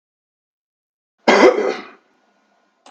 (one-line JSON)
{"cough_length": "2.9 s", "cough_amplitude": 32768, "cough_signal_mean_std_ratio": 0.31, "survey_phase": "beta (2021-08-13 to 2022-03-07)", "age": "65+", "gender": "Male", "wearing_mask": "No", "symptom_none": true, "smoker_status": "Never smoked", "respiratory_condition_asthma": false, "respiratory_condition_other": false, "recruitment_source": "REACT", "submission_delay": "3 days", "covid_test_result": "Negative", "covid_test_method": "RT-qPCR", "influenza_a_test_result": "Negative", "influenza_b_test_result": "Negative"}